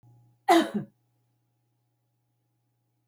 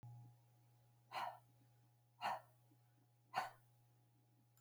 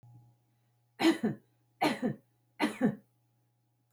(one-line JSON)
{"cough_length": "3.1 s", "cough_amplitude": 14446, "cough_signal_mean_std_ratio": 0.23, "exhalation_length": "4.6 s", "exhalation_amplitude": 1229, "exhalation_signal_mean_std_ratio": 0.38, "three_cough_length": "3.9 s", "three_cough_amplitude": 6189, "three_cough_signal_mean_std_ratio": 0.37, "survey_phase": "beta (2021-08-13 to 2022-03-07)", "age": "65+", "gender": "Female", "wearing_mask": "No", "symptom_fatigue": true, "smoker_status": "Never smoked", "respiratory_condition_asthma": false, "respiratory_condition_other": false, "recruitment_source": "REACT", "submission_delay": "11 days", "covid_test_result": "Negative", "covid_test_method": "RT-qPCR"}